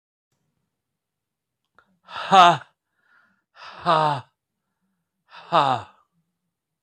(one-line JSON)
{"exhalation_length": "6.8 s", "exhalation_amplitude": 25552, "exhalation_signal_mean_std_ratio": 0.27, "survey_phase": "beta (2021-08-13 to 2022-03-07)", "age": "65+", "gender": "Male", "wearing_mask": "No", "symptom_fatigue": true, "smoker_status": "Never smoked", "respiratory_condition_asthma": false, "respiratory_condition_other": false, "recruitment_source": "REACT", "submission_delay": "1 day", "covid_test_result": "Negative", "covid_test_method": "RT-qPCR"}